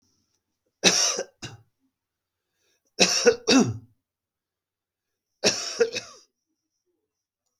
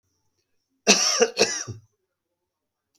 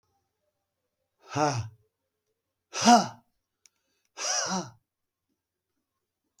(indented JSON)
{
  "three_cough_length": "7.6 s",
  "three_cough_amplitude": 27252,
  "three_cough_signal_mean_std_ratio": 0.32,
  "cough_length": "3.0 s",
  "cough_amplitude": 29204,
  "cough_signal_mean_std_ratio": 0.34,
  "exhalation_length": "6.4 s",
  "exhalation_amplitude": 18675,
  "exhalation_signal_mean_std_ratio": 0.27,
  "survey_phase": "beta (2021-08-13 to 2022-03-07)",
  "age": "65+",
  "gender": "Male",
  "wearing_mask": "No",
  "symptom_none": true,
  "smoker_status": "Ex-smoker",
  "respiratory_condition_asthma": false,
  "respiratory_condition_other": false,
  "recruitment_source": "REACT",
  "submission_delay": "2 days",
  "covid_test_result": "Negative",
  "covid_test_method": "RT-qPCR",
  "influenza_a_test_result": "Negative",
  "influenza_b_test_result": "Negative"
}